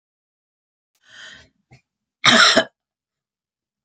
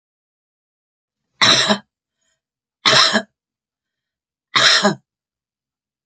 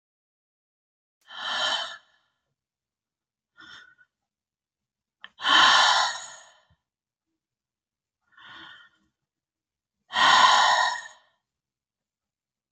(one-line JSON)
{"cough_length": "3.8 s", "cough_amplitude": 32767, "cough_signal_mean_std_ratio": 0.26, "three_cough_length": "6.1 s", "three_cough_amplitude": 32767, "three_cough_signal_mean_std_ratio": 0.34, "exhalation_length": "12.7 s", "exhalation_amplitude": 20947, "exhalation_signal_mean_std_ratio": 0.32, "survey_phase": "beta (2021-08-13 to 2022-03-07)", "age": "65+", "gender": "Female", "wearing_mask": "No", "symptom_none": true, "symptom_onset": "4 days", "smoker_status": "Ex-smoker", "respiratory_condition_asthma": false, "respiratory_condition_other": false, "recruitment_source": "REACT", "submission_delay": "4 days", "covid_test_result": "Negative", "covid_test_method": "RT-qPCR", "influenza_a_test_result": "Negative", "influenza_b_test_result": "Negative"}